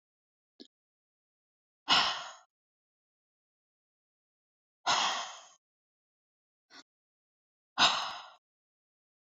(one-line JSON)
{"exhalation_length": "9.3 s", "exhalation_amplitude": 8490, "exhalation_signal_mean_std_ratio": 0.26, "survey_phase": "beta (2021-08-13 to 2022-03-07)", "age": "45-64", "gender": "Female", "wearing_mask": "No", "symptom_none": true, "smoker_status": "Ex-smoker", "respiratory_condition_asthma": false, "respiratory_condition_other": false, "recruitment_source": "REACT", "submission_delay": "0 days", "covid_test_result": "Negative", "covid_test_method": "RT-qPCR"}